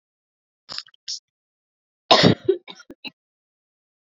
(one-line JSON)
{"cough_length": "4.1 s", "cough_amplitude": 28076, "cough_signal_mean_std_ratio": 0.23, "survey_phase": "beta (2021-08-13 to 2022-03-07)", "age": "45-64", "gender": "Female", "wearing_mask": "No", "symptom_cough_any": true, "symptom_runny_or_blocked_nose": true, "symptom_shortness_of_breath": true, "symptom_abdominal_pain": true, "symptom_diarrhoea": true, "symptom_fatigue": true, "symptom_onset": "5 days", "smoker_status": "Ex-smoker", "respiratory_condition_asthma": false, "respiratory_condition_other": false, "recruitment_source": "Test and Trace", "submission_delay": "2 days", "covid_test_result": "Positive", "covid_test_method": "RT-qPCR", "covid_ct_value": 15.8, "covid_ct_gene": "ORF1ab gene", "covid_ct_mean": 16.3, "covid_viral_load": "4400000 copies/ml", "covid_viral_load_category": "High viral load (>1M copies/ml)"}